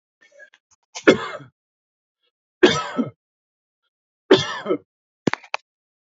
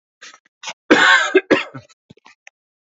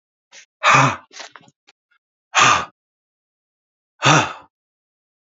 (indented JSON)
{
  "three_cough_length": "6.1 s",
  "three_cough_amplitude": 32767,
  "three_cough_signal_mean_std_ratio": 0.26,
  "cough_length": "3.0 s",
  "cough_amplitude": 32767,
  "cough_signal_mean_std_ratio": 0.37,
  "exhalation_length": "5.2 s",
  "exhalation_amplitude": 31788,
  "exhalation_signal_mean_std_ratio": 0.33,
  "survey_phase": "alpha (2021-03-01 to 2021-08-12)",
  "age": "45-64",
  "gender": "Male",
  "wearing_mask": "No",
  "symptom_none": true,
  "smoker_status": "Never smoked",
  "respiratory_condition_asthma": true,
  "respiratory_condition_other": false,
  "recruitment_source": "REACT",
  "submission_delay": "1 day",
  "covid_test_result": "Negative",
  "covid_test_method": "RT-qPCR"
}